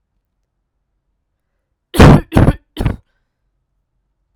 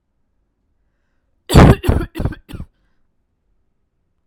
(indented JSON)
{
  "three_cough_length": "4.4 s",
  "three_cough_amplitude": 32768,
  "three_cough_signal_mean_std_ratio": 0.28,
  "cough_length": "4.3 s",
  "cough_amplitude": 32768,
  "cough_signal_mean_std_ratio": 0.26,
  "survey_phase": "alpha (2021-03-01 to 2021-08-12)",
  "age": "18-44",
  "gender": "Female",
  "wearing_mask": "No",
  "symptom_none": true,
  "smoker_status": "Never smoked",
  "respiratory_condition_asthma": false,
  "respiratory_condition_other": false,
  "recruitment_source": "REACT",
  "submission_delay": "1 day",
  "covid_test_result": "Negative",
  "covid_test_method": "RT-qPCR"
}